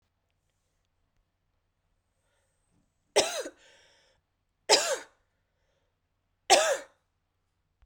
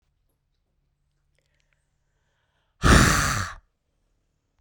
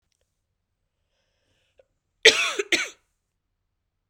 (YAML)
three_cough_length: 7.9 s
three_cough_amplitude: 17343
three_cough_signal_mean_std_ratio: 0.23
exhalation_length: 4.6 s
exhalation_amplitude: 22317
exhalation_signal_mean_std_ratio: 0.28
cough_length: 4.1 s
cough_amplitude: 32768
cough_signal_mean_std_ratio: 0.21
survey_phase: beta (2021-08-13 to 2022-03-07)
age: 18-44
gender: Female
wearing_mask: 'No'
symptom_cough_any: true
symptom_runny_or_blocked_nose: true
symptom_headache: true
symptom_change_to_sense_of_smell_or_taste: true
symptom_other: true
symptom_onset: 2 days
smoker_status: Never smoked
respiratory_condition_asthma: false
respiratory_condition_other: false
recruitment_source: Test and Trace
submission_delay: 2 days
covid_test_result: Positive
covid_test_method: LAMP